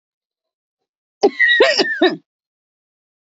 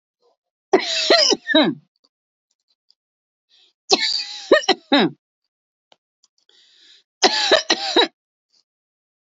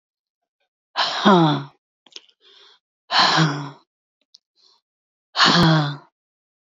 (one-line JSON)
{"cough_length": "3.3 s", "cough_amplitude": 27743, "cough_signal_mean_std_ratio": 0.39, "three_cough_length": "9.2 s", "three_cough_amplitude": 31450, "three_cough_signal_mean_std_ratio": 0.37, "exhalation_length": "6.7 s", "exhalation_amplitude": 26190, "exhalation_signal_mean_std_ratio": 0.41, "survey_phase": "beta (2021-08-13 to 2022-03-07)", "age": "18-44", "gender": "Female", "wearing_mask": "No", "symptom_sore_throat": true, "symptom_diarrhoea": true, "symptom_fatigue": true, "symptom_headache": true, "smoker_status": "Never smoked", "respiratory_condition_asthma": false, "respiratory_condition_other": false, "recruitment_source": "Test and Trace", "submission_delay": "3 days", "covid_test_result": "Positive", "covid_test_method": "RT-qPCR", "covid_ct_value": 27.8, "covid_ct_gene": "N gene", "covid_ct_mean": 27.8, "covid_viral_load": "760 copies/ml", "covid_viral_load_category": "Minimal viral load (< 10K copies/ml)"}